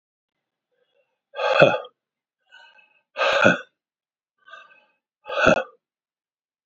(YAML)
exhalation_length: 6.7 s
exhalation_amplitude: 32768
exhalation_signal_mean_std_ratio: 0.3
survey_phase: beta (2021-08-13 to 2022-03-07)
age: 45-64
gender: Male
wearing_mask: 'No'
symptom_none: true
smoker_status: Ex-smoker
respiratory_condition_asthma: false
respiratory_condition_other: false
recruitment_source: REACT
submission_delay: 2 days
covid_test_result: Negative
covid_test_method: RT-qPCR